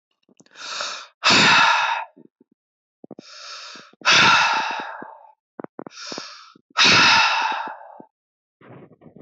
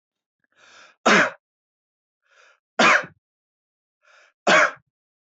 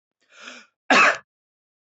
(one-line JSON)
{"exhalation_length": "9.2 s", "exhalation_amplitude": 23684, "exhalation_signal_mean_std_ratio": 0.47, "three_cough_length": "5.4 s", "three_cough_amplitude": 20173, "three_cough_signal_mean_std_ratio": 0.3, "cough_length": "1.9 s", "cough_amplitude": 20189, "cough_signal_mean_std_ratio": 0.31, "survey_phase": "beta (2021-08-13 to 2022-03-07)", "age": "18-44", "gender": "Male", "wearing_mask": "No", "symptom_fatigue": true, "symptom_change_to_sense_of_smell_or_taste": true, "symptom_loss_of_taste": true, "smoker_status": "Never smoked", "respiratory_condition_asthma": true, "respiratory_condition_other": false, "recruitment_source": "REACT", "submission_delay": "2 days", "covid_test_result": "Negative", "covid_test_method": "RT-qPCR", "influenza_a_test_result": "Negative", "influenza_b_test_result": "Negative"}